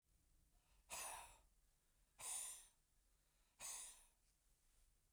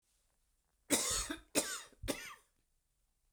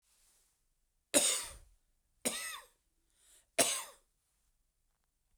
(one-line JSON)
{"exhalation_length": "5.1 s", "exhalation_amplitude": 427, "exhalation_signal_mean_std_ratio": 0.46, "cough_length": "3.3 s", "cough_amplitude": 5296, "cough_signal_mean_std_ratio": 0.39, "three_cough_length": "5.4 s", "three_cough_amplitude": 8549, "three_cough_signal_mean_std_ratio": 0.29, "survey_phase": "beta (2021-08-13 to 2022-03-07)", "age": "45-64", "gender": "Male", "wearing_mask": "No", "symptom_cough_any": true, "symptom_sore_throat": true, "symptom_fatigue": true, "symptom_headache": true, "smoker_status": "Never smoked", "respiratory_condition_asthma": false, "respiratory_condition_other": false, "recruitment_source": "Test and Trace", "submission_delay": "2 days", "covid_test_result": "Positive", "covid_test_method": "RT-qPCR", "covid_ct_value": 34.6, "covid_ct_gene": "ORF1ab gene", "covid_ct_mean": 34.9, "covid_viral_load": "3.5 copies/ml", "covid_viral_load_category": "Minimal viral load (< 10K copies/ml)"}